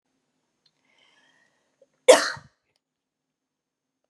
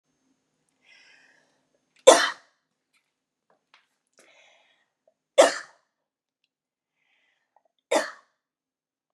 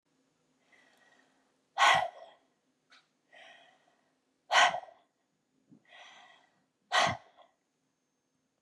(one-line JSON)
{"cough_length": "4.1 s", "cough_amplitude": 30145, "cough_signal_mean_std_ratio": 0.15, "three_cough_length": "9.1 s", "three_cough_amplitude": 32662, "three_cough_signal_mean_std_ratio": 0.16, "exhalation_length": "8.6 s", "exhalation_amplitude": 9783, "exhalation_signal_mean_std_ratio": 0.25, "survey_phase": "beta (2021-08-13 to 2022-03-07)", "age": "45-64", "gender": "Female", "wearing_mask": "No", "symptom_none": true, "smoker_status": "Never smoked", "respiratory_condition_asthma": true, "respiratory_condition_other": false, "recruitment_source": "Test and Trace", "submission_delay": "2 days", "covid_test_result": "Positive", "covid_test_method": "RT-qPCR", "covid_ct_value": 31.9, "covid_ct_gene": "ORF1ab gene", "covid_ct_mean": 32.1, "covid_viral_load": "29 copies/ml", "covid_viral_load_category": "Minimal viral load (< 10K copies/ml)"}